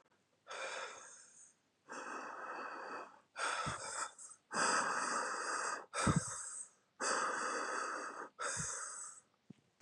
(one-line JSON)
{"exhalation_length": "9.8 s", "exhalation_amplitude": 3572, "exhalation_signal_mean_std_ratio": 0.69, "survey_phase": "beta (2021-08-13 to 2022-03-07)", "age": "45-64", "gender": "Female", "wearing_mask": "No", "symptom_cough_any": true, "symptom_fatigue": true, "symptom_headache": true, "symptom_onset": "6 days", "smoker_status": "Never smoked", "respiratory_condition_asthma": false, "respiratory_condition_other": false, "recruitment_source": "Test and Trace", "submission_delay": "1 day", "covid_test_result": "Positive", "covid_test_method": "RT-qPCR", "covid_ct_value": 21.4, "covid_ct_gene": "ORF1ab gene", "covid_ct_mean": 22.3, "covid_viral_load": "50000 copies/ml", "covid_viral_load_category": "Low viral load (10K-1M copies/ml)"}